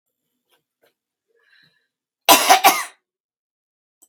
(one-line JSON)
{"cough_length": "4.1 s", "cough_amplitude": 32767, "cough_signal_mean_std_ratio": 0.25, "survey_phase": "beta (2021-08-13 to 2022-03-07)", "age": "45-64", "gender": "Female", "wearing_mask": "No", "symptom_cough_any": true, "symptom_runny_or_blocked_nose": true, "symptom_fatigue": true, "smoker_status": "Never smoked", "respiratory_condition_asthma": false, "respiratory_condition_other": false, "recruitment_source": "REACT", "submission_delay": "0 days", "covid_test_result": "Negative", "covid_test_method": "RT-qPCR"}